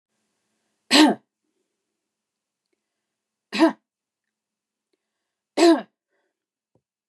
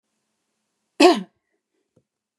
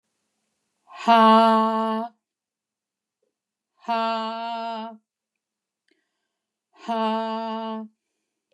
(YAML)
three_cough_length: 7.1 s
three_cough_amplitude: 27906
three_cough_signal_mean_std_ratio: 0.23
cough_length: 2.4 s
cough_amplitude: 29721
cough_signal_mean_std_ratio: 0.22
exhalation_length: 8.5 s
exhalation_amplitude: 18593
exhalation_signal_mean_std_ratio: 0.39
survey_phase: beta (2021-08-13 to 2022-03-07)
age: 65+
gender: Female
wearing_mask: 'No'
symptom_headache: true
smoker_status: Never smoked
respiratory_condition_asthma: false
respiratory_condition_other: false
recruitment_source: REACT
submission_delay: 2 days
covid_test_result: Negative
covid_test_method: RT-qPCR
influenza_a_test_result: Negative
influenza_b_test_result: Negative